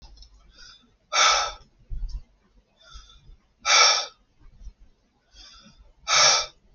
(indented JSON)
{
  "exhalation_length": "6.7 s",
  "exhalation_amplitude": 19996,
  "exhalation_signal_mean_std_ratio": 0.37,
  "survey_phase": "beta (2021-08-13 to 2022-03-07)",
  "age": "18-44",
  "gender": "Male",
  "wearing_mask": "No",
  "symptom_cough_any": true,
  "symptom_runny_or_blocked_nose": true,
  "symptom_sore_throat": true,
  "symptom_headache": true,
  "symptom_onset": "8 days",
  "smoker_status": "Never smoked",
  "respiratory_condition_asthma": false,
  "respiratory_condition_other": false,
  "recruitment_source": "Test and Trace",
  "submission_delay": "2 days",
  "covid_test_result": "Positive",
  "covid_test_method": "RT-qPCR",
  "covid_ct_value": 30.6,
  "covid_ct_gene": "N gene",
  "covid_ct_mean": 31.2,
  "covid_viral_load": "57 copies/ml",
  "covid_viral_load_category": "Minimal viral load (< 10K copies/ml)"
}